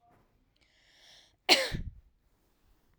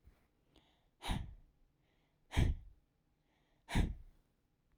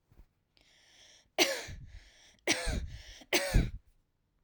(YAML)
cough_length: 3.0 s
cough_amplitude: 18107
cough_signal_mean_std_ratio: 0.24
exhalation_length: 4.8 s
exhalation_amplitude: 3910
exhalation_signal_mean_std_ratio: 0.3
three_cough_length: 4.4 s
three_cough_amplitude: 9032
three_cough_signal_mean_std_ratio: 0.38
survey_phase: alpha (2021-03-01 to 2021-08-12)
age: 18-44
gender: Female
wearing_mask: 'No'
symptom_none: true
smoker_status: Never smoked
respiratory_condition_asthma: false
respiratory_condition_other: false
recruitment_source: REACT
submission_delay: 1 day
covid_test_result: Negative
covid_test_method: RT-qPCR